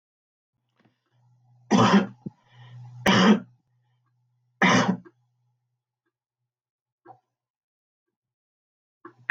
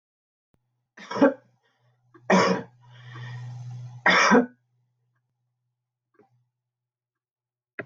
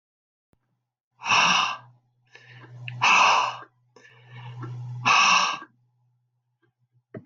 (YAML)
cough_length: 9.3 s
cough_amplitude: 16364
cough_signal_mean_std_ratio: 0.28
three_cough_length: 7.9 s
three_cough_amplitude: 15941
three_cough_signal_mean_std_ratio: 0.31
exhalation_length: 7.3 s
exhalation_amplitude: 15069
exhalation_signal_mean_std_ratio: 0.43
survey_phase: alpha (2021-03-01 to 2021-08-12)
age: 65+
gender: Female
wearing_mask: 'No'
symptom_none: true
smoker_status: Never smoked
respiratory_condition_asthma: false
respiratory_condition_other: false
recruitment_source: REACT
submission_delay: 1 day
covid_test_result: Negative
covid_test_method: RT-qPCR